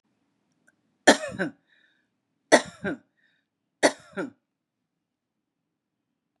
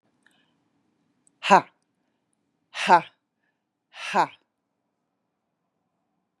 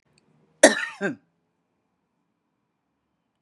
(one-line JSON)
{"three_cough_length": "6.4 s", "three_cough_amplitude": 30110, "three_cough_signal_mean_std_ratio": 0.2, "exhalation_length": "6.4 s", "exhalation_amplitude": 29476, "exhalation_signal_mean_std_ratio": 0.19, "cough_length": "3.4 s", "cough_amplitude": 32767, "cough_signal_mean_std_ratio": 0.18, "survey_phase": "beta (2021-08-13 to 2022-03-07)", "age": "65+", "gender": "Female", "wearing_mask": "No", "symptom_none": true, "smoker_status": "Never smoked", "respiratory_condition_asthma": false, "respiratory_condition_other": false, "recruitment_source": "REACT", "submission_delay": "3 days", "covid_test_result": "Negative", "covid_test_method": "RT-qPCR", "influenza_a_test_result": "Unknown/Void", "influenza_b_test_result": "Unknown/Void"}